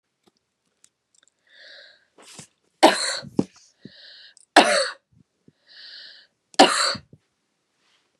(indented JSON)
{
  "three_cough_length": "8.2 s",
  "three_cough_amplitude": 29204,
  "three_cough_signal_mean_std_ratio": 0.25,
  "survey_phase": "beta (2021-08-13 to 2022-03-07)",
  "age": "65+",
  "gender": "Female",
  "wearing_mask": "No",
  "symptom_none": true,
  "smoker_status": "Never smoked",
  "respiratory_condition_asthma": false,
  "respiratory_condition_other": false,
  "recruitment_source": "REACT",
  "submission_delay": "3 days",
  "covid_test_result": "Negative",
  "covid_test_method": "RT-qPCR",
  "influenza_a_test_result": "Negative",
  "influenza_b_test_result": "Negative"
}